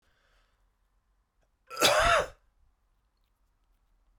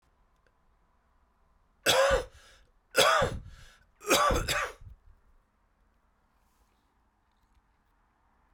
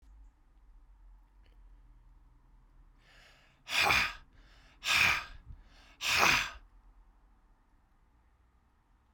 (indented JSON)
{
  "cough_length": "4.2 s",
  "cough_amplitude": 14622,
  "cough_signal_mean_std_ratio": 0.28,
  "three_cough_length": "8.5 s",
  "three_cough_amplitude": 12664,
  "three_cough_signal_mean_std_ratio": 0.34,
  "exhalation_length": "9.1 s",
  "exhalation_amplitude": 11138,
  "exhalation_signal_mean_std_ratio": 0.34,
  "survey_phase": "beta (2021-08-13 to 2022-03-07)",
  "age": "65+",
  "gender": "Male",
  "wearing_mask": "No",
  "symptom_cough_any": true,
  "symptom_runny_or_blocked_nose": true,
  "symptom_fatigue": true,
  "symptom_fever_high_temperature": true,
  "symptom_headache": true,
  "smoker_status": "Current smoker (1 to 10 cigarettes per day)",
  "respiratory_condition_asthma": false,
  "respiratory_condition_other": false,
  "recruitment_source": "Test and Trace",
  "submission_delay": "1 day",
  "covid_test_result": "Positive",
  "covid_test_method": "RT-qPCR",
  "covid_ct_value": 20.1,
  "covid_ct_gene": "ORF1ab gene"
}